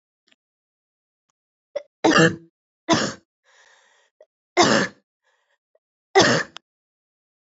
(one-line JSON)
{"three_cough_length": "7.5 s", "three_cough_amplitude": 26791, "three_cough_signal_mean_std_ratio": 0.3, "survey_phase": "beta (2021-08-13 to 2022-03-07)", "age": "18-44", "gender": "Female", "wearing_mask": "No", "symptom_cough_any": true, "symptom_new_continuous_cough": true, "symptom_runny_or_blocked_nose": true, "symptom_shortness_of_breath": true, "symptom_fatigue": true, "symptom_headache": true, "symptom_onset": "2 days", "smoker_status": "Never smoked", "respiratory_condition_asthma": false, "respiratory_condition_other": false, "recruitment_source": "Test and Trace", "submission_delay": "1 day", "covid_test_result": "Positive", "covid_test_method": "RT-qPCR", "covid_ct_value": 19.9, "covid_ct_gene": "ORF1ab gene", "covid_ct_mean": 20.5, "covid_viral_load": "180000 copies/ml", "covid_viral_load_category": "Low viral load (10K-1M copies/ml)"}